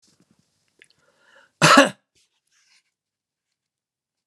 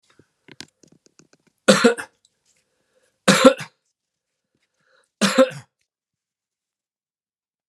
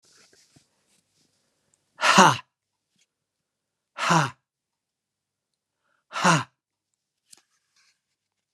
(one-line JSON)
{"cough_length": "4.3 s", "cough_amplitude": 32767, "cough_signal_mean_std_ratio": 0.2, "three_cough_length": "7.7 s", "three_cough_amplitude": 32768, "three_cough_signal_mean_std_ratio": 0.23, "exhalation_length": "8.5 s", "exhalation_amplitude": 29314, "exhalation_signal_mean_std_ratio": 0.23, "survey_phase": "beta (2021-08-13 to 2022-03-07)", "age": "65+", "gender": "Male", "wearing_mask": "No", "symptom_none": true, "smoker_status": "Never smoked", "respiratory_condition_asthma": false, "respiratory_condition_other": false, "recruitment_source": "REACT", "submission_delay": "2 days", "covid_test_result": "Negative", "covid_test_method": "RT-qPCR"}